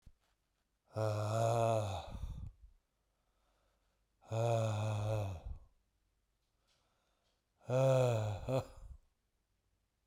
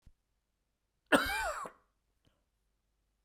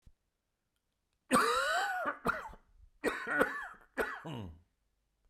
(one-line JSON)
{"exhalation_length": "10.1 s", "exhalation_amplitude": 2691, "exhalation_signal_mean_std_ratio": 0.52, "cough_length": "3.2 s", "cough_amplitude": 9129, "cough_signal_mean_std_ratio": 0.27, "three_cough_length": "5.3 s", "three_cough_amplitude": 8298, "three_cough_signal_mean_std_ratio": 0.49, "survey_phase": "beta (2021-08-13 to 2022-03-07)", "age": "45-64", "gender": "Male", "wearing_mask": "No", "symptom_cough_any": true, "symptom_new_continuous_cough": true, "symptom_shortness_of_breath": true, "symptom_sore_throat": true, "symptom_fatigue": true, "symptom_fever_high_temperature": true, "symptom_headache": true, "symptom_change_to_sense_of_smell_or_taste": true, "symptom_onset": "3 days", "smoker_status": "Ex-smoker", "respiratory_condition_asthma": false, "respiratory_condition_other": false, "recruitment_source": "Test and Trace", "submission_delay": "3 days", "covid_test_result": "Positive", "covid_test_method": "RT-qPCR", "covid_ct_value": 18.1, "covid_ct_gene": "ORF1ab gene", "covid_ct_mean": 19.4, "covid_viral_load": "430000 copies/ml", "covid_viral_load_category": "Low viral load (10K-1M copies/ml)"}